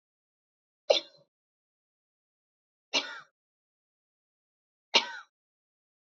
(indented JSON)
{
  "three_cough_length": "6.1 s",
  "three_cough_amplitude": 13678,
  "three_cough_signal_mean_std_ratio": 0.17,
  "survey_phase": "beta (2021-08-13 to 2022-03-07)",
  "age": "18-44",
  "gender": "Female",
  "wearing_mask": "No",
  "symptom_none": true,
  "smoker_status": "Never smoked",
  "respiratory_condition_asthma": true,
  "respiratory_condition_other": false,
  "recruitment_source": "REACT",
  "submission_delay": "1 day",
  "covid_test_result": "Negative",
  "covid_test_method": "RT-qPCR",
  "influenza_a_test_result": "Negative",
  "influenza_b_test_result": "Negative"
}